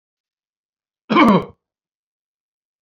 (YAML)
cough_length: 2.8 s
cough_amplitude: 27868
cough_signal_mean_std_ratio: 0.27
survey_phase: beta (2021-08-13 to 2022-03-07)
age: 45-64
gender: Male
wearing_mask: 'No'
symptom_none: true
smoker_status: Ex-smoker
respiratory_condition_asthma: false
respiratory_condition_other: false
recruitment_source: REACT
submission_delay: 3 days
covid_test_result: Negative
covid_test_method: RT-qPCR